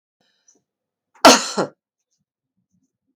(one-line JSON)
{"cough_length": "3.2 s", "cough_amplitude": 32768, "cough_signal_mean_std_ratio": 0.21, "survey_phase": "beta (2021-08-13 to 2022-03-07)", "age": "65+", "gender": "Female", "wearing_mask": "No", "symptom_none": true, "smoker_status": "Never smoked", "respiratory_condition_asthma": false, "respiratory_condition_other": false, "recruitment_source": "REACT", "submission_delay": "7 days", "covid_test_result": "Negative", "covid_test_method": "RT-qPCR", "influenza_a_test_result": "Negative", "influenza_b_test_result": "Negative"}